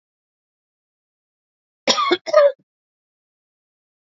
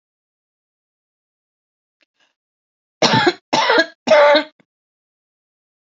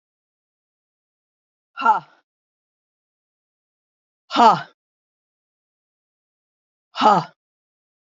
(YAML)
cough_length: 4.1 s
cough_amplitude: 27486
cough_signal_mean_std_ratio: 0.27
three_cough_length: 5.8 s
three_cough_amplitude: 30414
three_cough_signal_mean_std_ratio: 0.33
exhalation_length: 8.0 s
exhalation_amplitude: 27536
exhalation_signal_mean_std_ratio: 0.22
survey_phase: alpha (2021-03-01 to 2021-08-12)
age: 65+
gender: Female
wearing_mask: 'No'
symptom_cough_any: true
smoker_status: Never smoked
respiratory_condition_asthma: false
respiratory_condition_other: false
recruitment_source: REACT
submission_delay: 4 days
covid_test_result: Negative
covid_test_method: RT-qPCR